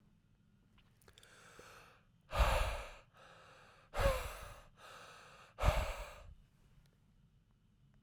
exhalation_length: 8.0 s
exhalation_amplitude: 4179
exhalation_signal_mean_std_ratio: 0.36
survey_phase: beta (2021-08-13 to 2022-03-07)
age: 18-44
gender: Male
wearing_mask: 'No'
symptom_cough_any: true
symptom_runny_or_blocked_nose: true
symptom_sore_throat: true
symptom_fatigue: true
symptom_headache: true
smoker_status: Never smoked
respiratory_condition_asthma: false
respiratory_condition_other: false
recruitment_source: Test and Trace
submission_delay: 0 days
covid_test_result: Positive
covid_test_method: LFT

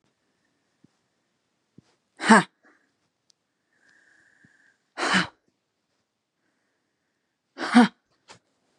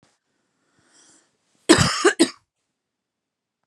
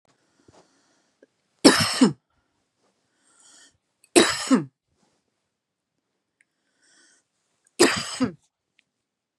exhalation_length: 8.8 s
exhalation_amplitude: 26462
exhalation_signal_mean_std_ratio: 0.2
cough_length: 3.7 s
cough_amplitude: 32766
cough_signal_mean_std_ratio: 0.26
three_cough_length: 9.4 s
three_cough_amplitude: 32767
three_cough_signal_mean_std_ratio: 0.25
survey_phase: beta (2021-08-13 to 2022-03-07)
age: 18-44
gender: Female
wearing_mask: 'No'
symptom_none: true
smoker_status: Ex-smoker
respiratory_condition_asthma: true
respiratory_condition_other: false
recruitment_source: REACT
submission_delay: 1 day
covid_test_result: Negative
covid_test_method: RT-qPCR
influenza_a_test_result: Negative
influenza_b_test_result: Negative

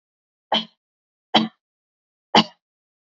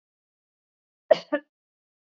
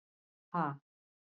three_cough_length: 3.2 s
three_cough_amplitude: 29223
three_cough_signal_mean_std_ratio: 0.23
cough_length: 2.1 s
cough_amplitude: 21123
cough_signal_mean_std_ratio: 0.15
exhalation_length: 1.4 s
exhalation_amplitude: 3420
exhalation_signal_mean_std_ratio: 0.29
survey_phase: beta (2021-08-13 to 2022-03-07)
age: 45-64
gender: Female
wearing_mask: 'Yes'
symptom_sore_throat: true
symptom_onset: 13 days
smoker_status: Never smoked
respiratory_condition_asthma: false
respiratory_condition_other: false
recruitment_source: REACT
submission_delay: 2 days
covid_test_result: Negative
covid_test_method: RT-qPCR
influenza_a_test_result: Negative
influenza_b_test_result: Negative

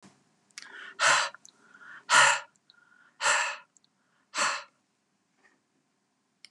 exhalation_length: 6.5 s
exhalation_amplitude: 14050
exhalation_signal_mean_std_ratio: 0.33
survey_phase: beta (2021-08-13 to 2022-03-07)
age: 65+
gender: Female
wearing_mask: 'No'
symptom_abdominal_pain: true
symptom_fatigue: true
symptom_onset: 12 days
smoker_status: Never smoked
respiratory_condition_asthma: false
respiratory_condition_other: false
recruitment_source: REACT
submission_delay: 1 day
covid_test_result: Negative
covid_test_method: RT-qPCR
influenza_a_test_result: Negative
influenza_b_test_result: Negative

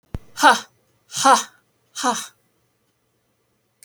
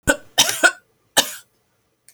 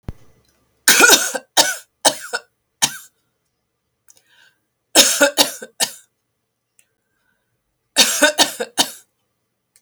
exhalation_length: 3.8 s
exhalation_amplitude: 32639
exhalation_signal_mean_std_ratio: 0.31
cough_length: 2.1 s
cough_amplitude: 32767
cough_signal_mean_std_ratio: 0.34
three_cough_length: 9.8 s
three_cough_amplitude: 32768
three_cough_signal_mean_std_ratio: 0.33
survey_phase: alpha (2021-03-01 to 2021-08-12)
age: 45-64
gender: Female
wearing_mask: 'No'
symptom_none: true
smoker_status: Never smoked
respiratory_condition_asthma: false
respiratory_condition_other: false
recruitment_source: REACT
submission_delay: 2 days
covid_test_result: Negative
covid_test_method: RT-qPCR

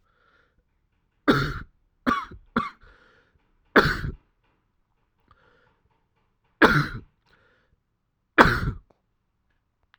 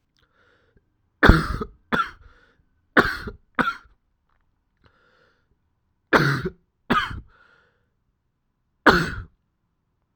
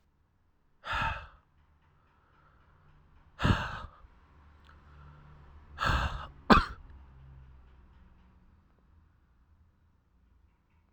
three_cough_length: 10.0 s
three_cough_amplitude: 32768
three_cough_signal_mean_std_ratio: 0.27
cough_length: 10.2 s
cough_amplitude: 32768
cough_signal_mean_std_ratio: 0.28
exhalation_length: 10.9 s
exhalation_amplitude: 19750
exhalation_signal_mean_std_ratio: 0.27
survey_phase: alpha (2021-03-01 to 2021-08-12)
age: 18-44
gender: Male
wearing_mask: 'Yes'
symptom_cough_any: true
symptom_new_continuous_cough: true
symptom_shortness_of_breath: true
symptom_fatigue: true
symptom_fever_high_temperature: true
symptom_headache: true
symptom_change_to_sense_of_smell_or_taste: true
symptom_loss_of_taste: true
symptom_onset: 2 days
smoker_status: Current smoker (1 to 10 cigarettes per day)
respiratory_condition_asthma: false
respiratory_condition_other: false
recruitment_source: Test and Trace
submission_delay: 1 day
covid_test_result: Positive
covid_test_method: RT-qPCR
covid_ct_value: 16.8
covid_ct_gene: ORF1ab gene
covid_ct_mean: 17.3
covid_viral_load: 2100000 copies/ml
covid_viral_load_category: High viral load (>1M copies/ml)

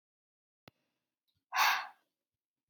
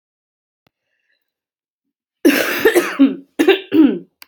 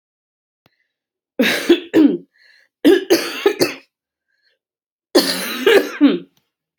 exhalation_length: 2.7 s
exhalation_amplitude: 5167
exhalation_signal_mean_std_ratio: 0.26
cough_length: 4.3 s
cough_amplitude: 30349
cough_signal_mean_std_ratio: 0.42
three_cough_length: 6.8 s
three_cough_amplitude: 32768
three_cough_signal_mean_std_ratio: 0.42
survey_phase: alpha (2021-03-01 to 2021-08-12)
age: 18-44
gender: Female
wearing_mask: 'No'
symptom_cough_any: true
symptom_new_continuous_cough: true
symptom_fatigue: true
symptom_fever_high_temperature: true
symptom_headache: true
symptom_change_to_sense_of_smell_or_taste: true
symptom_onset: 5 days
smoker_status: Current smoker (11 or more cigarettes per day)
respiratory_condition_asthma: false
respiratory_condition_other: false
recruitment_source: Test and Trace
submission_delay: 1 day
covid_test_result: Positive
covid_test_method: RT-qPCR
covid_ct_value: 12.6
covid_ct_gene: ORF1ab gene
covid_ct_mean: 12.9
covid_viral_load: 59000000 copies/ml
covid_viral_load_category: High viral load (>1M copies/ml)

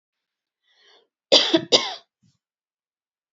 cough_length: 3.3 s
cough_amplitude: 28948
cough_signal_mean_std_ratio: 0.26
survey_phase: beta (2021-08-13 to 2022-03-07)
age: 18-44
gender: Female
wearing_mask: 'No'
symptom_none: true
smoker_status: Never smoked
respiratory_condition_asthma: false
respiratory_condition_other: false
recruitment_source: REACT
submission_delay: 2 days
covid_test_result: Negative
covid_test_method: RT-qPCR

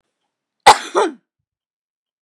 cough_length: 2.2 s
cough_amplitude: 32768
cough_signal_mean_std_ratio: 0.24
survey_phase: beta (2021-08-13 to 2022-03-07)
age: 18-44
gender: Female
wearing_mask: 'No'
symptom_none: true
smoker_status: Never smoked
respiratory_condition_asthma: false
respiratory_condition_other: false
recruitment_source: REACT
submission_delay: 4 days
covid_test_result: Negative
covid_test_method: RT-qPCR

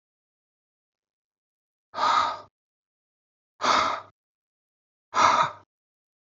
exhalation_length: 6.2 s
exhalation_amplitude: 17884
exhalation_signal_mean_std_ratio: 0.34
survey_phase: beta (2021-08-13 to 2022-03-07)
age: 18-44
gender: Male
wearing_mask: 'No'
symptom_sore_throat: true
smoker_status: Never smoked
respiratory_condition_asthma: false
respiratory_condition_other: false
recruitment_source: REACT
submission_delay: 1 day
covid_test_result: Negative
covid_test_method: RT-qPCR
influenza_a_test_result: Negative
influenza_b_test_result: Negative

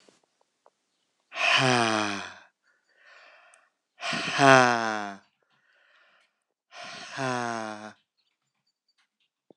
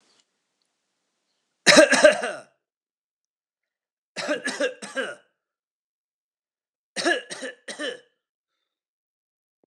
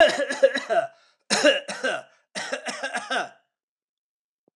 exhalation_length: 9.6 s
exhalation_amplitude: 25390
exhalation_signal_mean_std_ratio: 0.33
three_cough_length: 9.7 s
three_cough_amplitude: 26028
three_cough_signal_mean_std_ratio: 0.26
cough_length: 4.6 s
cough_amplitude: 23088
cough_signal_mean_std_ratio: 0.46
survey_phase: alpha (2021-03-01 to 2021-08-12)
age: 45-64
gender: Male
wearing_mask: 'No'
symptom_none: true
smoker_status: Never smoked
respiratory_condition_asthma: false
respiratory_condition_other: false
recruitment_source: REACT
submission_delay: 3 days
covid_test_result: Negative
covid_test_method: RT-qPCR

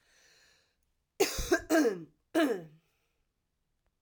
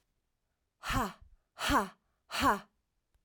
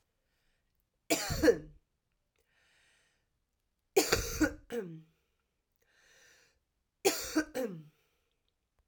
cough_length: 4.0 s
cough_amplitude: 6980
cough_signal_mean_std_ratio: 0.37
exhalation_length: 3.2 s
exhalation_amplitude: 5163
exhalation_signal_mean_std_ratio: 0.39
three_cough_length: 8.9 s
three_cough_amplitude: 10242
three_cough_signal_mean_std_ratio: 0.3
survey_phase: alpha (2021-03-01 to 2021-08-12)
age: 45-64
gender: Female
wearing_mask: 'No'
symptom_cough_any: true
symptom_fatigue: true
symptom_change_to_sense_of_smell_or_taste: true
symptom_loss_of_taste: true
symptom_onset: 3 days
smoker_status: Never smoked
respiratory_condition_asthma: true
respiratory_condition_other: false
recruitment_source: Test and Trace
submission_delay: 2 days
covid_test_result: Positive
covid_test_method: RT-qPCR
covid_ct_value: 17.0
covid_ct_gene: ORF1ab gene
covid_ct_mean: 17.5
covid_viral_load: 1800000 copies/ml
covid_viral_load_category: High viral load (>1M copies/ml)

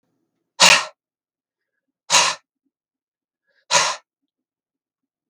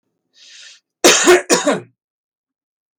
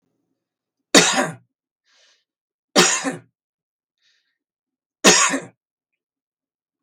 exhalation_length: 5.3 s
exhalation_amplitude: 32768
exhalation_signal_mean_std_ratio: 0.26
cough_length: 3.0 s
cough_amplitude: 32768
cough_signal_mean_std_ratio: 0.37
three_cough_length: 6.8 s
three_cough_amplitude: 32768
three_cough_signal_mean_std_ratio: 0.28
survey_phase: beta (2021-08-13 to 2022-03-07)
age: 45-64
gender: Male
wearing_mask: 'No'
symptom_none: true
smoker_status: Never smoked
respiratory_condition_asthma: false
respiratory_condition_other: false
recruitment_source: REACT
submission_delay: 2 days
covid_test_result: Negative
covid_test_method: RT-qPCR
influenza_a_test_result: Negative
influenza_b_test_result: Negative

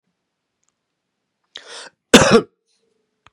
cough_length: 3.3 s
cough_amplitude: 32768
cough_signal_mean_std_ratio: 0.23
survey_phase: beta (2021-08-13 to 2022-03-07)
age: 45-64
gender: Male
wearing_mask: 'No'
symptom_cough_any: true
symptom_onset: 7 days
smoker_status: Ex-smoker
respiratory_condition_asthma: false
respiratory_condition_other: false
recruitment_source: REACT
submission_delay: 2 days
covid_test_result: Negative
covid_test_method: RT-qPCR
influenza_a_test_result: Negative
influenza_b_test_result: Negative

